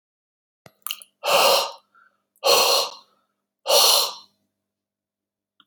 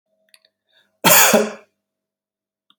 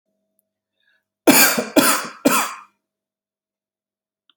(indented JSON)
{
  "exhalation_length": "5.7 s",
  "exhalation_amplitude": 21822,
  "exhalation_signal_mean_std_ratio": 0.4,
  "cough_length": "2.8 s",
  "cough_amplitude": 32768,
  "cough_signal_mean_std_ratio": 0.32,
  "three_cough_length": "4.4 s",
  "three_cough_amplitude": 32768,
  "three_cough_signal_mean_std_ratio": 0.35,
  "survey_phase": "beta (2021-08-13 to 2022-03-07)",
  "age": "45-64",
  "gender": "Male",
  "wearing_mask": "No",
  "symptom_none": true,
  "smoker_status": "Never smoked",
  "respiratory_condition_asthma": false,
  "respiratory_condition_other": false,
  "recruitment_source": "REACT",
  "submission_delay": "1 day",
  "covid_test_result": "Negative",
  "covid_test_method": "RT-qPCR"
}